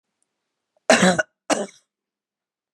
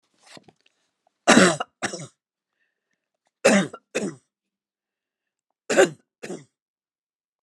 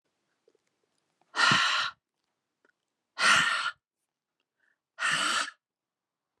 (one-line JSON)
{"cough_length": "2.7 s", "cough_amplitude": 28400, "cough_signal_mean_std_ratio": 0.29, "three_cough_length": "7.4 s", "three_cough_amplitude": 32365, "three_cough_signal_mean_std_ratio": 0.26, "exhalation_length": "6.4 s", "exhalation_amplitude": 11052, "exhalation_signal_mean_std_ratio": 0.39, "survey_phase": "alpha (2021-03-01 to 2021-08-12)", "age": "45-64", "gender": "Female", "wearing_mask": "No", "symptom_none": true, "symptom_onset": "2 days", "smoker_status": "Never smoked", "respiratory_condition_asthma": false, "respiratory_condition_other": false, "recruitment_source": "Test and Trace", "submission_delay": "1 day", "covid_test_result": "Positive", "covid_test_method": "RT-qPCR"}